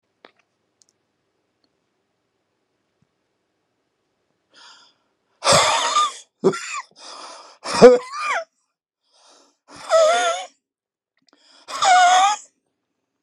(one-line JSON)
{"exhalation_length": "13.2 s", "exhalation_amplitude": 32768, "exhalation_signal_mean_std_ratio": 0.34, "survey_phase": "beta (2021-08-13 to 2022-03-07)", "age": "65+", "gender": "Male", "wearing_mask": "No", "symptom_cough_any": true, "symptom_sore_throat": true, "symptom_fatigue": true, "symptom_onset": "12 days", "smoker_status": "Never smoked", "respiratory_condition_asthma": false, "respiratory_condition_other": false, "recruitment_source": "REACT", "submission_delay": "5 days", "covid_test_result": "Negative", "covid_test_method": "RT-qPCR"}